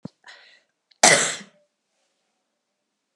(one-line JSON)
{"cough_length": "3.2 s", "cough_amplitude": 32767, "cough_signal_mean_std_ratio": 0.23, "survey_phase": "beta (2021-08-13 to 2022-03-07)", "age": "65+", "gender": "Female", "wearing_mask": "No", "symptom_none": true, "smoker_status": "Never smoked", "respiratory_condition_asthma": false, "respiratory_condition_other": false, "recruitment_source": "REACT", "submission_delay": "1 day", "covid_test_result": "Negative", "covid_test_method": "RT-qPCR"}